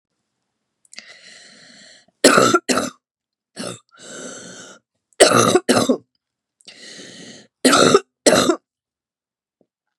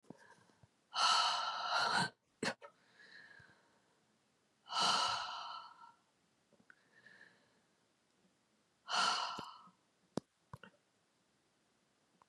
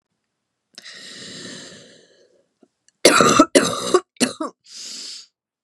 {"three_cough_length": "10.0 s", "three_cough_amplitude": 32768, "three_cough_signal_mean_std_ratio": 0.35, "exhalation_length": "12.3 s", "exhalation_amplitude": 3313, "exhalation_signal_mean_std_ratio": 0.39, "cough_length": "5.6 s", "cough_amplitude": 32768, "cough_signal_mean_std_ratio": 0.34, "survey_phase": "beta (2021-08-13 to 2022-03-07)", "age": "45-64", "gender": "Female", "wearing_mask": "No", "symptom_new_continuous_cough": true, "symptom_runny_or_blocked_nose": true, "symptom_shortness_of_breath": true, "symptom_sore_throat": true, "symptom_abdominal_pain": true, "symptom_fatigue": true, "symptom_fever_high_temperature": true, "symptom_headache": true, "symptom_change_to_sense_of_smell_or_taste": true, "symptom_onset": "2 days", "smoker_status": "Never smoked", "respiratory_condition_asthma": false, "respiratory_condition_other": true, "recruitment_source": "Test and Trace", "submission_delay": "1 day", "covid_test_result": "Positive", "covid_test_method": "RT-qPCR", "covid_ct_value": 25.4, "covid_ct_gene": "N gene"}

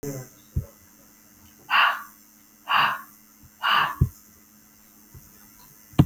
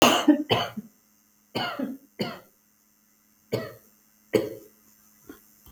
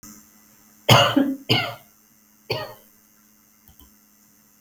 {"exhalation_length": "6.1 s", "exhalation_amplitude": 24307, "exhalation_signal_mean_std_ratio": 0.37, "three_cough_length": "5.7 s", "three_cough_amplitude": 22847, "three_cough_signal_mean_std_ratio": 0.35, "cough_length": "4.6 s", "cough_amplitude": 32277, "cough_signal_mean_std_ratio": 0.32, "survey_phase": "beta (2021-08-13 to 2022-03-07)", "age": "45-64", "gender": "Female", "wearing_mask": "No", "symptom_cough_any": true, "symptom_runny_or_blocked_nose": true, "symptom_onset": "11 days", "smoker_status": "Never smoked", "respiratory_condition_asthma": false, "respiratory_condition_other": false, "recruitment_source": "REACT", "submission_delay": "2 days", "covid_test_result": "Negative", "covid_test_method": "RT-qPCR", "influenza_a_test_result": "Negative", "influenza_b_test_result": "Negative"}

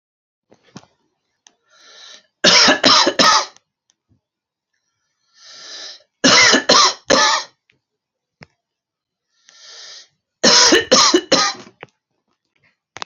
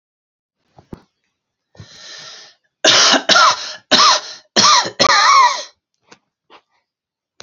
{"three_cough_length": "13.1 s", "three_cough_amplitude": 32768, "three_cough_signal_mean_std_ratio": 0.38, "cough_length": "7.4 s", "cough_amplitude": 32768, "cough_signal_mean_std_ratio": 0.44, "survey_phase": "beta (2021-08-13 to 2022-03-07)", "age": "45-64", "gender": "Male", "wearing_mask": "No", "symptom_none": true, "smoker_status": "Never smoked", "respiratory_condition_asthma": false, "respiratory_condition_other": false, "recruitment_source": "REACT", "submission_delay": "3 days", "covid_test_result": "Negative", "covid_test_method": "RT-qPCR"}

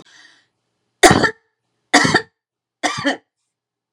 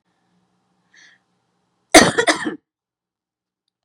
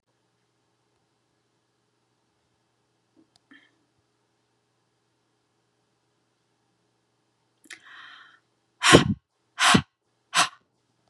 {"three_cough_length": "3.9 s", "three_cough_amplitude": 32768, "three_cough_signal_mean_std_ratio": 0.32, "cough_length": "3.8 s", "cough_amplitude": 32768, "cough_signal_mean_std_ratio": 0.23, "exhalation_length": "11.1 s", "exhalation_amplitude": 32672, "exhalation_signal_mean_std_ratio": 0.18, "survey_phase": "beta (2021-08-13 to 2022-03-07)", "age": "45-64", "gender": "Female", "wearing_mask": "No", "symptom_none": true, "smoker_status": "Never smoked", "respiratory_condition_asthma": false, "respiratory_condition_other": false, "recruitment_source": "REACT", "submission_delay": "1 day", "covid_test_result": "Negative", "covid_test_method": "RT-qPCR"}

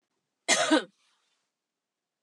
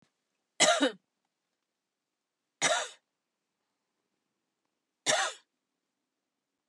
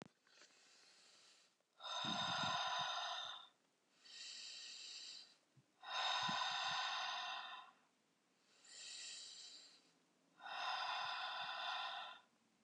{"cough_length": "2.2 s", "cough_amplitude": 10838, "cough_signal_mean_std_ratio": 0.29, "three_cough_length": "6.7 s", "three_cough_amplitude": 11702, "three_cough_signal_mean_std_ratio": 0.26, "exhalation_length": "12.6 s", "exhalation_amplitude": 1132, "exhalation_signal_mean_std_ratio": 0.66, "survey_phase": "beta (2021-08-13 to 2022-03-07)", "age": "45-64", "gender": "Female", "wearing_mask": "No", "symptom_loss_of_taste": true, "smoker_status": "Never smoked", "respiratory_condition_asthma": false, "respiratory_condition_other": false, "recruitment_source": "REACT", "submission_delay": "5 days", "covid_test_result": "Negative", "covid_test_method": "RT-qPCR"}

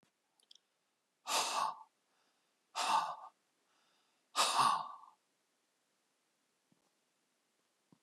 {"exhalation_length": "8.0 s", "exhalation_amplitude": 4165, "exhalation_signal_mean_std_ratio": 0.33, "survey_phase": "beta (2021-08-13 to 2022-03-07)", "age": "45-64", "gender": "Male", "wearing_mask": "No", "symptom_cough_any": true, "symptom_runny_or_blocked_nose": true, "symptom_sore_throat": true, "smoker_status": "Never smoked", "respiratory_condition_asthma": false, "respiratory_condition_other": false, "recruitment_source": "Test and Trace", "submission_delay": "0 days", "covid_test_result": "Positive", "covid_test_method": "LFT"}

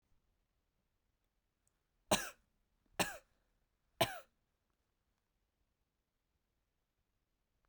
{"three_cough_length": "7.7 s", "three_cough_amplitude": 4336, "three_cough_signal_mean_std_ratio": 0.16, "survey_phase": "beta (2021-08-13 to 2022-03-07)", "age": "18-44", "gender": "Male", "wearing_mask": "No", "symptom_cough_any": true, "symptom_runny_or_blocked_nose": true, "symptom_fatigue": true, "symptom_headache": true, "symptom_change_to_sense_of_smell_or_taste": true, "symptom_onset": "5 days", "smoker_status": "Never smoked", "respiratory_condition_asthma": false, "respiratory_condition_other": false, "recruitment_source": "Test and Trace", "submission_delay": "1 day", "covid_test_result": "Positive", "covid_test_method": "RT-qPCR", "covid_ct_value": 19.6, "covid_ct_gene": "ORF1ab gene"}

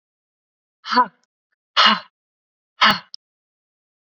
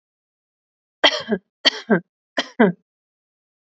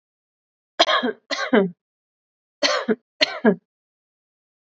{"exhalation_length": "4.0 s", "exhalation_amplitude": 27906, "exhalation_signal_mean_std_ratio": 0.28, "three_cough_length": "3.8 s", "three_cough_amplitude": 30221, "three_cough_signal_mean_std_ratio": 0.28, "cough_length": "4.8 s", "cough_amplitude": 28961, "cough_signal_mean_std_ratio": 0.35, "survey_phase": "beta (2021-08-13 to 2022-03-07)", "age": "18-44", "gender": "Female", "wearing_mask": "No", "symptom_none": true, "smoker_status": "Never smoked", "respiratory_condition_asthma": false, "respiratory_condition_other": false, "recruitment_source": "REACT", "submission_delay": "1 day", "covid_test_result": "Negative", "covid_test_method": "RT-qPCR", "influenza_a_test_result": "Unknown/Void", "influenza_b_test_result": "Unknown/Void"}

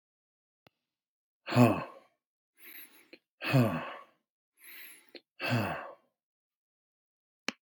{"exhalation_length": "7.6 s", "exhalation_amplitude": 12480, "exhalation_signal_mean_std_ratio": 0.29, "survey_phase": "beta (2021-08-13 to 2022-03-07)", "age": "45-64", "gender": "Male", "wearing_mask": "No", "symptom_none": true, "smoker_status": "Never smoked", "respiratory_condition_asthma": false, "respiratory_condition_other": false, "recruitment_source": "REACT", "submission_delay": "2 days", "covid_test_result": "Negative", "covid_test_method": "RT-qPCR"}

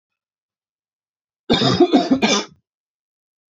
{"three_cough_length": "3.5 s", "three_cough_amplitude": 26062, "three_cough_signal_mean_std_ratio": 0.39, "survey_phase": "alpha (2021-03-01 to 2021-08-12)", "age": "18-44", "gender": "Male", "wearing_mask": "No", "symptom_cough_any": true, "symptom_new_continuous_cough": true, "symptom_abdominal_pain": true, "symptom_fatigue": true, "symptom_fever_high_temperature": true, "symptom_onset": "3 days", "smoker_status": "Never smoked", "respiratory_condition_asthma": false, "respiratory_condition_other": false, "recruitment_source": "Test and Trace", "submission_delay": "2 days", "covid_test_result": "Positive", "covid_test_method": "RT-qPCR", "covid_ct_value": 19.3, "covid_ct_gene": "ORF1ab gene", "covid_ct_mean": 20.4, "covid_viral_load": "210000 copies/ml", "covid_viral_load_category": "Low viral load (10K-1M copies/ml)"}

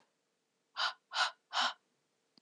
{"exhalation_length": "2.4 s", "exhalation_amplitude": 3767, "exhalation_signal_mean_std_ratio": 0.37, "survey_phase": "beta (2021-08-13 to 2022-03-07)", "age": "18-44", "gender": "Female", "wearing_mask": "No", "symptom_cough_any": true, "symptom_runny_or_blocked_nose": true, "symptom_change_to_sense_of_smell_or_taste": true, "symptom_loss_of_taste": true, "symptom_onset": "3 days", "smoker_status": "Never smoked", "respiratory_condition_asthma": false, "respiratory_condition_other": false, "recruitment_source": "Test and Trace", "submission_delay": "2 days", "covid_test_result": "Positive", "covid_test_method": "ePCR"}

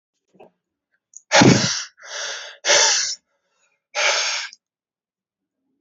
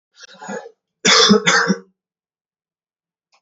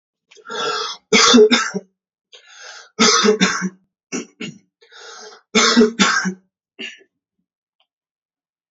{"exhalation_length": "5.8 s", "exhalation_amplitude": 29998, "exhalation_signal_mean_std_ratio": 0.4, "cough_length": "3.4 s", "cough_amplitude": 31416, "cough_signal_mean_std_ratio": 0.38, "three_cough_length": "8.7 s", "three_cough_amplitude": 31600, "three_cough_signal_mean_std_ratio": 0.43, "survey_phase": "beta (2021-08-13 to 2022-03-07)", "age": "45-64", "gender": "Male", "wearing_mask": "No", "symptom_cough_any": true, "symptom_new_continuous_cough": true, "symptom_sore_throat": true, "symptom_fever_high_temperature": true, "symptom_headache": true, "symptom_other": true, "symptom_onset": "4 days", "smoker_status": "Current smoker (e-cigarettes or vapes only)", "respiratory_condition_asthma": false, "respiratory_condition_other": false, "recruitment_source": "Test and Trace", "submission_delay": "1 day", "covid_test_result": "Positive", "covid_test_method": "RT-qPCR", "covid_ct_value": 33.0, "covid_ct_gene": "N gene"}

